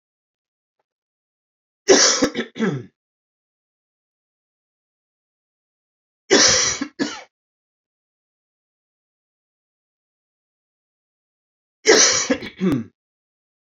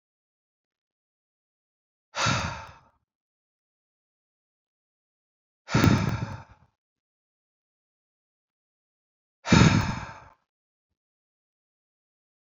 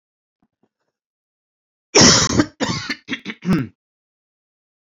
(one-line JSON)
{"three_cough_length": "13.7 s", "three_cough_amplitude": 32193, "three_cough_signal_mean_std_ratio": 0.29, "exhalation_length": "12.5 s", "exhalation_amplitude": 19921, "exhalation_signal_mean_std_ratio": 0.24, "cough_length": "4.9 s", "cough_amplitude": 32767, "cough_signal_mean_std_ratio": 0.33, "survey_phase": "beta (2021-08-13 to 2022-03-07)", "age": "18-44", "gender": "Male", "wearing_mask": "No", "symptom_cough_any": true, "symptom_new_continuous_cough": true, "symptom_headache": true, "smoker_status": "Never smoked", "respiratory_condition_asthma": false, "respiratory_condition_other": false, "recruitment_source": "Test and Trace", "submission_delay": "2 days", "covid_test_result": "Positive", "covid_test_method": "RT-qPCR"}